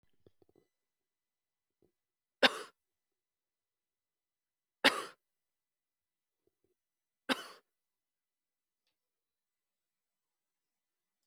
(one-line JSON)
{"three_cough_length": "11.3 s", "three_cough_amplitude": 11242, "three_cough_signal_mean_std_ratio": 0.12, "survey_phase": "alpha (2021-03-01 to 2021-08-12)", "age": "45-64", "gender": "Female", "wearing_mask": "No", "symptom_none": true, "smoker_status": "Ex-smoker", "respiratory_condition_asthma": false, "respiratory_condition_other": false, "recruitment_source": "REACT", "submission_delay": "1 day", "covid_test_result": "Negative", "covid_test_method": "RT-qPCR"}